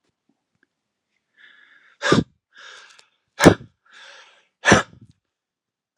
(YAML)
exhalation_length: 6.0 s
exhalation_amplitude: 32768
exhalation_signal_mean_std_ratio: 0.21
survey_phase: alpha (2021-03-01 to 2021-08-12)
age: 45-64
gender: Male
wearing_mask: 'No'
symptom_none: true
smoker_status: Never smoked
respiratory_condition_asthma: false
respiratory_condition_other: false
recruitment_source: REACT
submission_delay: 2 days
covid_test_result: Negative
covid_test_method: RT-qPCR